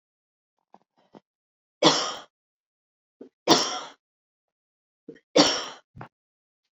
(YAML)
three_cough_length: 6.7 s
three_cough_amplitude: 23896
three_cough_signal_mean_std_ratio: 0.26
survey_phase: beta (2021-08-13 to 2022-03-07)
age: 18-44
gender: Female
wearing_mask: 'No'
symptom_none: true
smoker_status: Never smoked
respiratory_condition_asthma: false
respiratory_condition_other: false
recruitment_source: REACT
submission_delay: 3 days
covid_test_result: Negative
covid_test_method: RT-qPCR
influenza_a_test_result: Unknown/Void
influenza_b_test_result: Unknown/Void